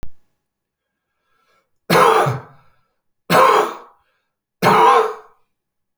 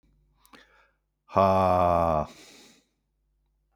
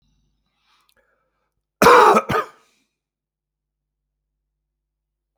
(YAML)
three_cough_length: 6.0 s
three_cough_amplitude: 31502
three_cough_signal_mean_std_ratio: 0.41
exhalation_length: 3.8 s
exhalation_amplitude: 16638
exhalation_signal_mean_std_ratio: 0.39
cough_length: 5.4 s
cough_amplitude: 28967
cough_signal_mean_std_ratio: 0.24
survey_phase: beta (2021-08-13 to 2022-03-07)
age: 45-64
gender: Male
wearing_mask: 'No'
symptom_none: true
smoker_status: Never smoked
respiratory_condition_asthma: false
respiratory_condition_other: false
recruitment_source: REACT
submission_delay: 2 days
covid_test_result: Negative
covid_test_method: RT-qPCR